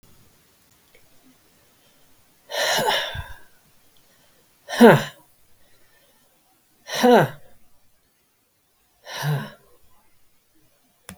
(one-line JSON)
{"exhalation_length": "11.2 s", "exhalation_amplitude": 32768, "exhalation_signal_mean_std_ratio": 0.27, "survey_phase": "beta (2021-08-13 to 2022-03-07)", "age": "65+", "gender": "Female", "wearing_mask": "No", "symptom_none": true, "smoker_status": "Ex-smoker", "respiratory_condition_asthma": true, "respiratory_condition_other": false, "recruitment_source": "REACT", "submission_delay": "1 day", "covid_test_result": "Negative", "covid_test_method": "RT-qPCR", "influenza_a_test_result": "Negative", "influenza_b_test_result": "Negative"}